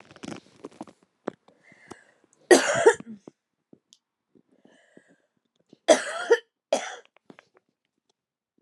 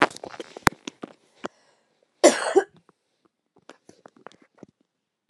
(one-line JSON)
{"three_cough_length": "8.6 s", "three_cough_amplitude": 26951, "three_cough_signal_mean_std_ratio": 0.23, "cough_length": "5.3 s", "cough_amplitude": 32768, "cough_signal_mean_std_ratio": 0.2, "survey_phase": "alpha (2021-03-01 to 2021-08-12)", "age": "45-64", "gender": "Female", "wearing_mask": "No", "symptom_fatigue": true, "symptom_headache": true, "smoker_status": "Current smoker (11 or more cigarettes per day)", "respiratory_condition_asthma": false, "respiratory_condition_other": false, "recruitment_source": "REACT", "submission_delay": "2 days", "covid_test_result": "Negative", "covid_test_method": "RT-qPCR"}